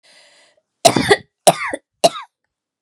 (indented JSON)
{
  "three_cough_length": "2.8 s",
  "three_cough_amplitude": 32768,
  "three_cough_signal_mean_std_ratio": 0.31,
  "survey_phase": "beta (2021-08-13 to 2022-03-07)",
  "age": "18-44",
  "gender": "Female",
  "wearing_mask": "No",
  "symptom_none": true,
  "smoker_status": "Never smoked",
  "respiratory_condition_asthma": true,
  "respiratory_condition_other": false,
  "recruitment_source": "REACT",
  "submission_delay": "1 day",
  "covid_test_result": "Negative",
  "covid_test_method": "RT-qPCR",
  "influenza_a_test_result": "Unknown/Void",
  "influenza_b_test_result": "Unknown/Void"
}